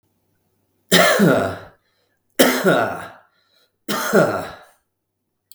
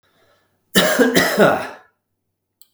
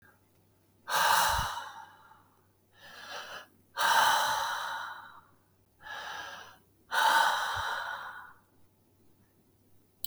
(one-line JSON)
{"three_cough_length": "5.5 s", "three_cough_amplitude": 32768, "three_cough_signal_mean_std_ratio": 0.45, "cough_length": "2.7 s", "cough_amplitude": 32768, "cough_signal_mean_std_ratio": 0.47, "exhalation_length": "10.1 s", "exhalation_amplitude": 7558, "exhalation_signal_mean_std_ratio": 0.49, "survey_phase": "beta (2021-08-13 to 2022-03-07)", "age": "45-64", "gender": "Male", "wearing_mask": "No", "symptom_none": true, "smoker_status": "Current smoker (1 to 10 cigarettes per day)", "respiratory_condition_asthma": false, "respiratory_condition_other": false, "recruitment_source": "REACT", "submission_delay": "5 days", "covid_test_result": "Negative", "covid_test_method": "RT-qPCR"}